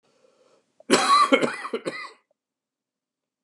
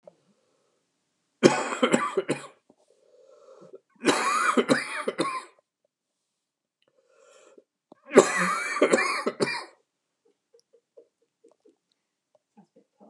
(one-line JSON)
{"cough_length": "3.4 s", "cough_amplitude": 24155, "cough_signal_mean_std_ratio": 0.37, "three_cough_length": "13.1 s", "three_cough_amplitude": 31982, "three_cough_signal_mean_std_ratio": 0.34, "survey_phase": "beta (2021-08-13 to 2022-03-07)", "age": "45-64", "gender": "Male", "wearing_mask": "No", "symptom_cough_any": true, "symptom_loss_of_taste": true, "symptom_onset": "8 days", "smoker_status": "Never smoked", "respiratory_condition_asthma": false, "respiratory_condition_other": false, "recruitment_source": "REACT", "submission_delay": "2 days", "covid_test_result": "Positive", "covid_test_method": "RT-qPCR", "covid_ct_value": 17.0, "covid_ct_gene": "E gene", "influenza_a_test_result": "Negative", "influenza_b_test_result": "Negative"}